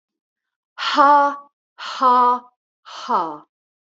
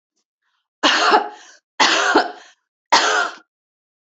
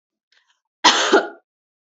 exhalation_length: 3.9 s
exhalation_amplitude: 26772
exhalation_signal_mean_std_ratio: 0.47
three_cough_length: 4.1 s
three_cough_amplitude: 31377
three_cough_signal_mean_std_ratio: 0.47
cough_length: 2.0 s
cough_amplitude: 31853
cough_signal_mean_std_ratio: 0.34
survey_phase: beta (2021-08-13 to 2022-03-07)
age: 18-44
gender: Female
wearing_mask: 'No'
symptom_none: true
symptom_onset: 6 days
smoker_status: Never smoked
respiratory_condition_asthma: false
respiratory_condition_other: false
recruitment_source: REACT
submission_delay: 2 days
covid_test_result: Negative
covid_test_method: RT-qPCR
influenza_a_test_result: Negative
influenza_b_test_result: Negative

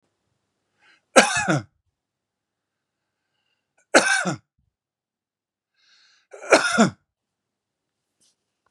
three_cough_length: 8.7 s
three_cough_amplitude: 32768
three_cough_signal_mean_std_ratio: 0.25
survey_phase: beta (2021-08-13 to 2022-03-07)
age: 65+
gender: Male
wearing_mask: 'No'
symptom_none: true
smoker_status: Current smoker (e-cigarettes or vapes only)
respiratory_condition_asthma: true
respiratory_condition_other: false
recruitment_source: REACT
submission_delay: 2 days
covid_test_result: Negative
covid_test_method: RT-qPCR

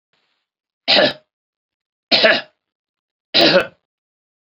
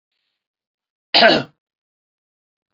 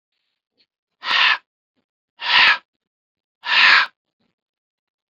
three_cough_length: 4.4 s
three_cough_amplitude: 31954
three_cough_signal_mean_std_ratio: 0.35
cough_length: 2.7 s
cough_amplitude: 32768
cough_signal_mean_std_ratio: 0.25
exhalation_length: 5.1 s
exhalation_amplitude: 28561
exhalation_signal_mean_std_ratio: 0.36
survey_phase: beta (2021-08-13 to 2022-03-07)
age: 45-64
gender: Male
wearing_mask: 'No'
symptom_none: true
smoker_status: Never smoked
respiratory_condition_asthma: false
respiratory_condition_other: false
recruitment_source: REACT
submission_delay: 2 days
covid_test_result: Negative
covid_test_method: RT-qPCR
influenza_a_test_result: Unknown/Void
influenza_b_test_result: Unknown/Void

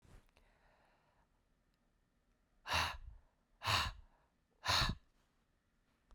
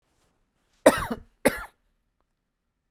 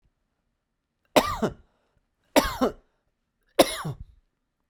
exhalation_length: 6.1 s
exhalation_amplitude: 2965
exhalation_signal_mean_std_ratio: 0.33
cough_length: 2.9 s
cough_amplitude: 25610
cough_signal_mean_std_ratio: 0.21
three_cough_length: 4.7 s
three_cough_amplitude: 24942
three_cough_signal_mean_std_ratio: 0.28
survey_phase: beta (2021-08-13 to 2022-03-07)
age: 18-44
gender: Male
wearing_mask: 'No'
symptom_none: true
smoker_status: Never smoked
respiratory_condition_asthma: false
respiratory_condition_other: false
recruitment_source: REACT
submission_delay: 2 days
covid_test_result: Negative
covid_test_method: RT-qPCR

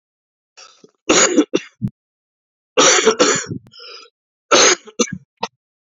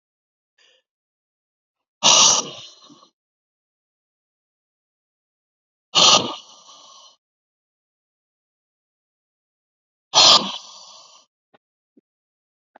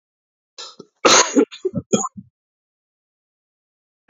three_cough_length: 5.8 s
three_cough_amplitude: 32768
three_cough_signal_mean_std_ratio: 0.41
exhalation_length: 12.8 s
exhalation_amplitude: 32768
exhalation_signal_mean_std_ratio: 0.23
cough_length: 4.1 s
cough_amplitude: 30146
cough_signal_mean_std_ratio: 0.29
survey_phase: beta (2021-08-13 to 2022-03-07)
age: 18-44
gender: Male
wearing_mask: 'No'
symptom_cough_any: true
symptom_runny_or_blocked_nose: true
symptom_shortness_of_breath: true
symptom_sore_throat: true
symptom_fatigue: true
symptom_headache: true
symptom_onset: 2 days
smoker_status: Ex-smoker
respiratory_condition_asthma: false
respiratory_condition_other: false
recruitment_source: Test and Trace
submission_delay: 1 day
covid_test_result: Positive
covid_test_method: ePCR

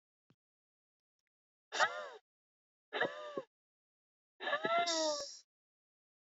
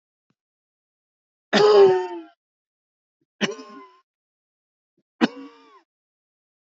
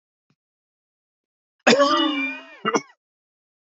exhalation_length: 6.3 s
exhalation_amplitude: 4305
exhalation_signal_mean_std_ratio: 0.38
three_cough_length: 6.7 s
three_cough_amplitude: 19961
three_cough_signal_mean_std_ratio: 0.27
cough_length: 3.8 s
cough_amplitude: 28077
cough_signal_mean_std_ratio: 0.36
survey_phase: beta (2021-08-13 to 2022-03-07)
age: 18-44
gender: Male
wearing_mask: 'No'
symptom_none: true
symptom_onset: 11 days
smoker_status: Never smoked
respiratory_condition_asthma: false
respiratory_condition_other: false
recruitment_source: REACT
submission_delay: 0 days
covid_test_result: Negative
covid_test_method: RT-qPCR
influenza_a_test_result: Negative
influenza_b_test_result: Negative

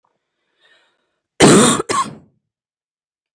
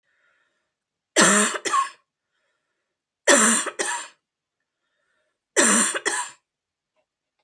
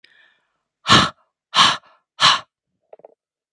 cough_length: 3.3 s
cough_amplitude: 31973
cough_signal_mean_std_ratio: 0.32
three_cough_length: 7.4 s
three_cough_amplitude: 26378
three_cough_signal_mean_std_ratio: 0.38
exhalation_length: 3.5 s
exhalation_amplitude: 32767
exhalation_signal_mean_std_ratio: 0.32
survey_phase: beta (2021-08-13 to 2022-03-07)
age: 18-44
gender: Female
wearing_mask: 'No'
symptom_none: true
smoker_status: Never smoked
respiratory_condition_asthma: false
respiratory_condition_other: false
recruitment_source: Test and Trace
submission_delay: 1 day
covid_test_result: Negative
covid_test_method: LFT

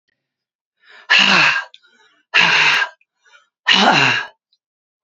exhalation_length: 5.0 s
exhalation_amplitude: 32767
exhalation_signal_mean_std_ratio: 0.48
survey_phase: beta (2021-08-13 to 2022-03-07)
age: 65+
gender: Female
wearing_mask: 'No'
symptom_cough_any: true
symptom_runny_or_blocked_nose: true
symptom_shortness_of_breath: true
symptom_fatigue: true
symptom_onset: 5 days
smoker_status: Ex-smoker
respiratory_condition_asthma: true
respiratory_condition_other: false
recruitment_source: REACT
submission_delay: 1 day
covid_test_result: Negative
covid_test_method: RT-qPCR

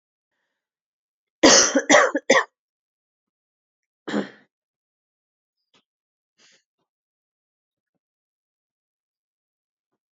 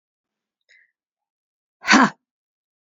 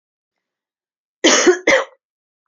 three_cough_length: 10.2 s
three_cough_amplitude: 29243
three_cough_signal_mean_std_ratio: 0.22
exhalation_length: 2.8 s
exhalation_amplitude: 27834
exhalation_signal_mean_std_ratio: 0.21
cough_length: 2.5 s
cough_amplitude: 31890
cough_signal_mean_std_ratio: 0.36
survey_phase: alpha (2021-03-01 to 2021-08-12)
age: 18-44
gender: Female
wearing_mask: 'No'
symptom_cough_any: true
symptom_new_continuous_cough: true
symptom_shortness_of_breath: true
symptom_fatigue: true
symptom_headache: true
symptom_change_to_sense_of_smell_or_taste: true
symptom_loss_of_taste: true
symptom_onset: 5 days
smoker_status: Never smoked
respiratory_condition_asthma: true
respiratory_condition_other: false
recruitment_source: Test and Trace
submission_delay: 2 days
covid_test_result: Positive
covid_test_method: RT-qPCR
covid_ct_value: 22.4
covid_ct_gene: ORF1ab gene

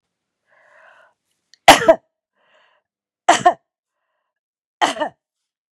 three_cough_length: 5.7 s
three_cough_amplitude: 32768
three_cough_signal_mean_std_ratio: 0.22
survey_phase: beta (2021-08-13 to 2022-03-07)
age: 45-64
gender: Female
wearing_mask: 'No'
symptom_none: true
smoker_status: Current smoker (1 to 10 cigarettes per day)
respiratory_condition_asthma: false
respiratory_condition_other: false
recruitment_source: REACT
submission_delay: 2 days
covid_test_result: Negative
covid_test_method: RT-qPCR
influenza_a_test_result: Negative
influenza_b_test_result: Negative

